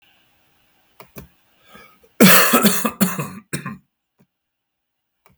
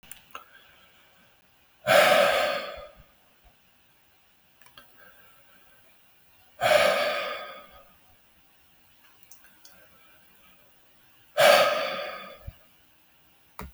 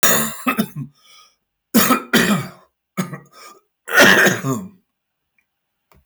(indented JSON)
{
  "cough_length": "5.4 s",
  "cough_amplitude": 32768,
  "cough_signal_mean_std_ratio": 0.33,
  "exhalation_length": "13.7 s",
  "exhalation_amplitude": 19493,
  "exhalation_signal_mean_std_ratio": 0.35,
  "three_cough_length": "6.1 s",
  "three_cough_amplitude": 28554,
  "three_cough_signal_mean_std_ratio": 0.45,
  "survey_phase": "beta (2021-08-13 to 2022-03-07)",
  "age": "65+",
  "gender": "Male",
  "wearing_mask": "No",
  "symptom_cough_any": true,
  "smoker_status": "Never smoked",
  "respiratory_condition_asthma": false,
  "respiratory_condition_other": false,
  "recruitment_source": "REACT",
  "submission_delay": "2 days",
  "covid_test_result": "Negative",
  "covid_test_method": "RT-qPCR",
  "influenza_a_test_result": "Negative",
  "influenza_b_test_result": "Negative"
}